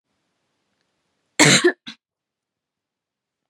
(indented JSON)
{
  "cough_length": "3.5 s",
  "cough_amplitude": 32767,
  "cough_signal_mean_std_ratio": 0.23,
  "survey_phase": "beta (2021-08-13 to 2022-03-07)",
  "age": "18-44",
  "gender": "Female",
  "wearing_mask": "No",
  "symptom_none": true,
  "symptom_onset": "8 days",
  "smoker_status": "Never smoked",
  "respiratory_condition_asthma": false,
  "respiratory_condition_other": false,
  "recruitment_source": "REACT",
  "submission_delay": "4 days",
  "covid_test_result": "Negative",
  "covid_test_method": "RT-qPCR",
  "influenza_a_test_result": "Negative",
  "influenza_b_test_result": "Negative"
}